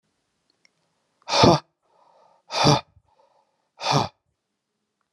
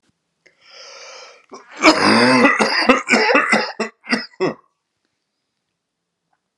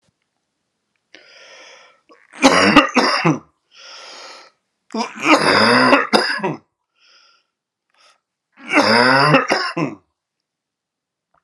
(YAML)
exhalation_length: 5.1 s
exhalation_amplitude: 28405
exhalation_signal_mean_std_ratio: 0.29
cough_length: 6.6 s
cough_amplitude: 32767
cough_signal_mean_std_ratio: 0.46
three_cough_length: 11.4 s
three_cough_amplitude: 32768
three_cough_signal_mean_std_ratio: 0.43
survey_phase: alpha (2021-03-01 to 2021-08-12)
age: 45-64
gender: Male
wearing_mask: 'No'
symptom_cough_any: true
symptom_fatigue: true
symptom_fever_high_temperature: true
symptom_headache: true
symptom_change_to_sense_of_smell_or_taste: true
symptom_onset: 3 days
smoker_status: Ex-smoker
respiratory_condition_asthma: false
respiratory_condition_other: false
recruitment_source: Test and Trace
submission_delay: 1 day
covid_test_result: Positive
covid_test_method: RT-qPCR
covid_ct_value: 14.2
covid_ct_gene: ORF1ab gene
covid_ct_mean: 14.8
covid_viral_load: 14000000 copies/ml
covid_viral_load_category: High viral load (>1M copies/ml)